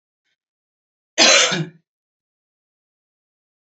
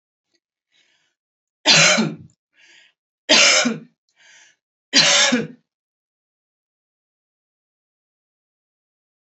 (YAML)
cough_length: 3.8 s
cough_amplitude: 32768
cough_signal_mean_std_ratio: 0.27
three_cough_length: 9.4 s
three_cough_amplitude: 32768
three_cough_signal_mean_std_ratio: 0.31
survey_phase: beta (2021-08-13 to 2022-03-07)
age: 45-64
gender: Female
wearing_mask: 'No'
symptom_none: true
smoker_status: Never smoked
respiratory_condition_asthma: false
respiratory_condition_other: false
recruitment_source: REACT
submission_delay: 2 days
covid_test_result: Negative
covid_test_method: RT-qPCR
influenza_a_test_result: Negative
influenza_b_test_result: Negative